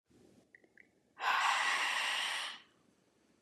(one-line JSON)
{"exhalation_length": "3.4 s", "exhalation_amplitude": 4209, "exhalation_signal_mean_std_ratio": 0.56, "survey_phase": "beta (2021-08-13 to 2022-03-07)", "age": "45-64", "gender": "Female", "wearing_mask": "No", "symptom_cough_any": true, "symptom_headache": true, "symptom_onset": "1 day", "smoker_status": "Prefer not to say", "respiratory_condition_asthma": false, "respiratory_condition_other": false, "recruitment_source": "Test and Trace", "submission_delay": "1 day", "covid_test_result": "Positive", "covid_test_method": "RT-qPCR", "covid_ct_value": 22.1, "covid_ct_gene": "ORF1ab gene", "covid_ct_mean": 23.1, "covid_viral_load": "27000 copies/ml", "covid_viral_load_category": "Low viral load (10K-1M copies/ml)"}